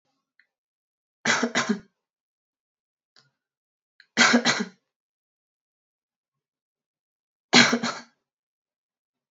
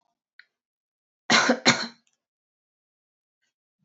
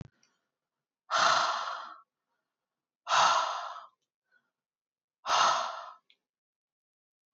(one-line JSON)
{"three_cough_length": "9.3 s", "three_cough_amplitude": 24684, "three_cough_signal_mean_std_ratio": 0.26, "cough_length": "3.8 s", "cough_amplitude": 22649, "cough_signal_mean_std_ratio": 0.25, "exhalation_length": "7.3 s", "exhalation_amplitude": 8401, "exhalation_signal_mean_std_ratio": 0.39, "survey_phase": "beta (2021-08-13 to 2022-03-07)", "age": "18-44", "gender": "Female", "wearing_mask": "No", "symptom_none": true, "symptom_onset": "4 days", "smoker_status": "Never smoked", "respiratory_condition_asthma": false, "respiratory_condition_other": false, "recruitment_source": "REACT", "submission_delay": "1 day", "covid_test_result": "Negative", "covid_test_method": "RT-qPCR", "influenza_a_test_result": "Negative", "influenza_b_test_result": "Negative"}